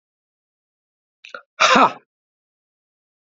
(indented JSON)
{
  "exhalation_length": "3.3 s",
  "exhalation_amplitude": 28892,
  "exhalation_signal_mean_std_ratio": 0.24,
  "survey_phase": "alpha (2021-03-01 to 2021-08-12)",
  "age": "18-44",
  "gender": "Male",
  "wearing_mask": "No",
  "symptom_cough_any": true,
  "symptom_fatigue": true,
  "symptom_headache": true,
  "symptom_change_to_sense_of_smell_or_taste": true,
  "symptom_onset": "4 days",
  "smoker_status": "Never smoked",
  "respiratory_condition_asthma": false,
  "respiratory_condition_other": false,
  "recruitment_source": "Test and Trace",
  "submission_delay": "2 days",
  "covid_test_result": "Positive",
  "covid_test_method": "RT-qPCR",
  "covid_ct_value": 17.7,
  "covid_ct_gene": "S gene",
  "covid_ct_mean": 18.1,
  "covid_viral_load": "1100000 copies/ml",
  "covid_viral_load_category": "High viral load (>1M copies/ml)"
}